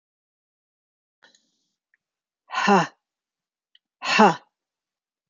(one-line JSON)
{"exhalation_length": "5.3 s", "exhalation_amplitude": 26622, "exhalation_signal_mean_std_ratio": 0.24, "survey_phase": "beta (2021-08-13 to 2022-03-07)", "age": "45-64", "gender": "Female", "wearing_mask": "No", "symptom_none": true, "smoker_status": "Never smoked", "respiratory_condition_asthma": false, "respiratory_condition_other": false, "recruitment_source": "REACT", "submission_delay": "1 day", "covid_test_result": "Negative", "covid_test_method": "RT-qPCR", "influenza_a_test_result": "Negative", "influenza_b_test_result": "Negative"}